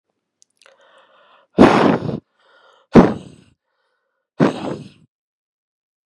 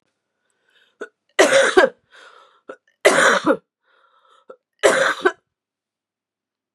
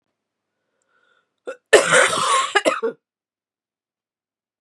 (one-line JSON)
{"exhalation_length": "6.1 s", "exhalation_amplitude": 32768, "exhalation_signal_mean_std_ratio": 0.28, "three_cough_length": "6.7 s", "three_cough_amplitude": 32767, "three_cough_signal_mean_std_ratio": 0.35, "cough_length": "4.6 s", "cough_amplitude": 32768, "cough_signal_mean_std_ratio": 0.35, "survey_phase": "beta (2021-08-13 to 2022-03-07)", "age": "18-44", "gender": "Female", "wearing_mask": "No", "symptom_cough_any": true, "symptom_runny_or_blocked_nose": true, "symptom_sore_throat": true, "symptom_fatigue": true, "symptom_change_to_sense_of_smell_or_taste": true, "symptom_onset": "4 days", "smoker_status": "Never smoked", "respiratory_condition_asthma": false, "respiratory_condition_other": false, "recruitment_source": "Test and Trace", "submission_delay": "2 days", "covid_test_result": "Positive", "covid_test_method": "RT-qPCR", "covid_ct_value": 34.7, "covid_ct_gene": "N gene"}